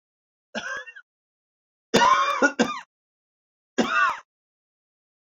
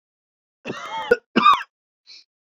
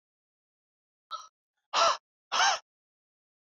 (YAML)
three_cough_length: 5.4 s
three_cough_amplitude: 22317
three_cough_signal_mean_std_ratio: 0.38
cough_length: 2.5 s
cough_amplitude: 24567
cough_signal_mean_std_ratio: 0.33
exhalation_length: 3.4 s
exhalation_amplitude: 7876
exhalation_signal_mean_std_ratio: 0.31
survey_phase: beta (2021-08-13 to 2022-03-07)
age: 18-44
gender: Male
wearing_mask: 'No'
symptom_cough_any: true
smoker_status: Never smoked
respiratory_condition_asthma: false
respiratory_condition_other: false
recruitment_source: Test and Trace
submission_delay: 1 day
covid_test_result: Positive
covid_test_method: RT-qPCR
covid_ct_value: 16.8
covid_ct_gene: ORF1ab gene
covid_ct_mean: 17.2
covid_viral_load: 2300000 copies/ml
covid_viral_load_category: High viral load (>1M copies/ml)